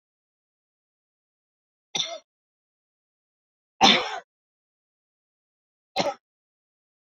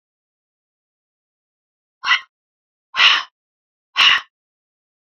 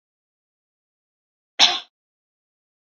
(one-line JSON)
{"three_cough_length": "7.1 s", "three_cough_amplitude": 21704, "three_cough_signal_mean_std_ratio": 0.2, "exhalation_length": "5.0 s", "exhalation_amplitude": 30162, "exhalation_signal_mean_std_ratio": 0.27, "cough_length": "2.8 s", "cough_amplitude": 31533, "cough_signal_mean_std_ratio": 0.18, "survey_phase": "beta (2021-08-13 to 2022-03-07)", "age": "45-64", "gender": "Female", "wearing_mask": "No", "symptom_none": true, "smoker_status": "Never smoked", "respiratory_condition_asthma": false, "respiratory_condition_other": false, "recruitment_source": "REACT", "submission_delay": "3 days", "covid_test_result": "Negative", "covid_test_method": "RT-qPCR"}